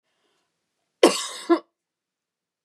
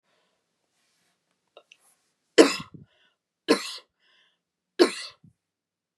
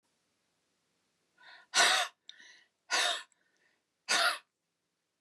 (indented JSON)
{
  "cough_length": "2.6 s",
  "cough_amplitude": 31850,
  "cough_signal_mean_std_ratio": 0.24,
  "three_cough_length": "6.0 s",
  "three_cough_amplitude": 32049,
  "three_cough_signal_mean_std_ratio": 0.19,
  "exhalation_length": "5.2 s",
  "exhalation_amplitude": 7526,
  "exhalation_signal_mean_std_ratio": 0.33,
  "survey_phase": "beta (2021-08-13 to 2022-03-07)",
  "age": "65+",
  "gender": "Female",
  "wearing_mask": "No",
  "symptom_none": true,
  "symptom_onset": "13 days",
  "smoker_status": "Ex-smoker",
  "respiratory_condition_asthma": false,
  "respiratory_condition_other": false,
  "recruitment_source": "REACT",
  "submission_delay": "2 days",
  "covid_test_result": "Negative",
  "covid_test_method": "RT-qPCR",
  "influenza_a_test_result": "Negative",
  "influenza_b_test_result": "Negative"
}